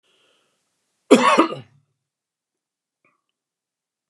{"cough_length": "4.1 s", "cough_amplitude": 31682, "cough_signal_mean_std_ratio": 0.23, "survey_phase": "beta (2021-08-13 to 2022-03-07)", "age": "45-64", "gender": "Male", "wearing_mask": "No", "symptom_none": true, "smoker_status": "Never smoked", "respiratory_condition_asthma": false, "respiratory_condition_other": false, "recruitment_source": "REACT", "submission_delay": "4 days", "covid_test_result": "Negative", "covid_test_method": "RT-qPCR", "influenza_a_test_result": "Negative", "influenza_b_test_result": "Negative"}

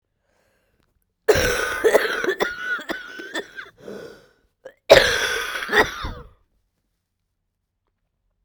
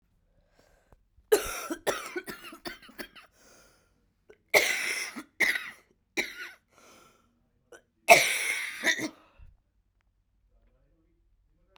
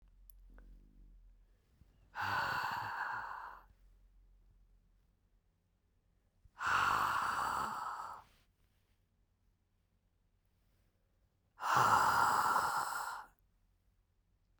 {"cough_length": "8.4 s", "cough_amplitude": 32768, "cough_signal_mean_std_ratio": 0.39, "three_cough_length": "11.8 s", "three_cough_amplitude": 23422, "three_cough_signal_mean_std_ratio": 0.31, "exhalation_length": "14.6 s", "exhalation_amplitude": 5090, "exhalation_signal_mean_std_ratio": 0.44, "survey_phase": "beta (2021-08-13 to 2022-03-07)", "age": "18-44", "gender": "Female", "wearing_mask": "No", "symptom_cough_any": true, "symptom_new_continuous_cough": true, "symptom_runny_or_blocked_nose": true, "symptom_shortness_of_breath": true, "symptom_sore_throat": true, "symptom_diarrhoea": true, "symptom_fatigue": true, "symptom_fever_high_temperature": true, "symptom_headache": true, "symptom_change_to_sense_of_smell_or_taste": true, "symptom_loss_of_taste": true, "symptom_onset": "5 days", "smoker_status": "Current smoker (e-cigarettes or vapes only)", "respiratory_condition_asthma": false, "respiratory_condition_other": false, "recruitment_source": "Test and Trace", "submission_delay": "1 day", "covid_test_result": "Positive", "covid_test_method": "RT-qPCR", "covid_ct_value": 19.3, "covid_ct_gene": "ORF1ab gene"}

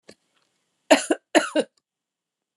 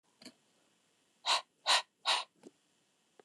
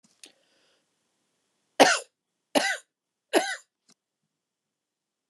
{"cough_length": "2.6 s", "cough_amplitude": 27544, "cough_signal_mean_std_ratio": 0.26, "exhalation_length": "3.2 s", "exhalation_amplitude": 6355, "exhalation_signal_mean_std_ratio": 0.3, "three_cough_length": "5.3 s", "three_cough_amplitude": 28087, "three_cough_signal_mean_std_ratio": 0.23, "survey_phase": "alpha (2021-03-01 to 2021-08-12)", "age": "45-64", "gender": "Female", "wearing_mask": "No", "symptom_none": true, "smoker_status": "Ex-smoker", "respiratory_condition_asthma": false, "respiratory_condition_other": false, "recruitment_source": "REACT", "submission_delay": "2 days", "covid_test_result": "Negative", "covid_test_method": "RT-qPCR"}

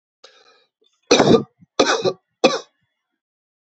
{"three_cough_length": "3.8 s", "three_cough_amplitude": 31036, "three_cough_signal_mean_std_ratio": 0.34, "survey_phase": "beta (2021-08-13 to 2022-03-07)", "age": "45-64", "gender": "Male", "wearing_mask": "No", "symptom_none": true, "smoker_status": "Current smoker (11 or more cigarettes per day)", "respiratory_condition_asthma": false, "respiratory_condition_other": false, "recruitment_source": "REACT", "submission_delay": "4 days", "covid_test_result": "Negative", "covid_test_method": "RT-qPCR"}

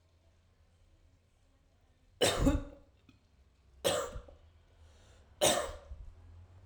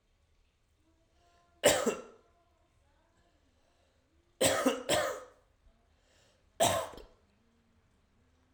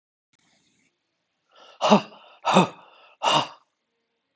{"three_cough_length": "6.7 s", "three_cough_amplitude": 6793, "three_cough_signal_mean_std_ratio": 0.35, "cough_length": "8.5 s", "cough_amplitude": 10893, "cough_signal_mean_std_ratio": 0.31, "exhalation_length": "4.4 s", "exhalation_amplitude": 26391, "exhalation_signal_mean_std_ratio": 0.3, "survey_phase": "alpha (2021-03-01 to 2021-08-12)", "age": "45-64", "gender": "Male", "wearing_mask": "No", "symptom_headache": true, "symptom_change_to_sense_of_smell_or_taste": true, "symptom_onset": "7 days", "smoker_status": "Never smoked", "respiratory_condition_asthma": false, "respiratory_condition_other": false, "recruitment_source": "Test and Trace", "submission_delay": "1 day", "covid_test_result": "Positive", "covid_test_method": "RT-qPCR"}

